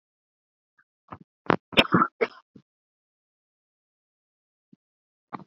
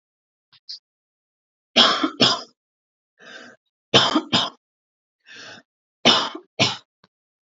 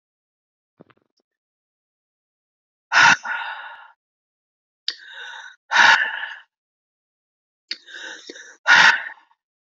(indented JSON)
{
  "cough_length": "5.5 s",
  "cough_amplitude": 26865,
  "cough_signal_mean_std_ratio": 0.18,
  "three_cough_length": "7.4 s",
  "three_cough_amplitude": 29461,
  "three_cough_signal_mean_std_ratio": 0.33,
  "exhalation_length": "9.7 s",
  "exhalation_amplitude": 29256,
  "exhalation_signal_mean_std_ratio": 0.29,
  "survey_phase": "beta (2021-08-13 to 2022-03-07)",
  "age": "18-44",
  "gender": "Female",
  "wearing_mask": "No",
  "symptom_cough_any": true,
  "smoker_status": "Never smoked",
  "respiratory_condition_asthma": true,
  "respiratory_condition_other": false,
  "recruitment_source": "Test and Trace",
  "submission_delay": "1 day",
  "covid_test_result": "Positive",
  "covid_test_method": "RT-qPCR"
}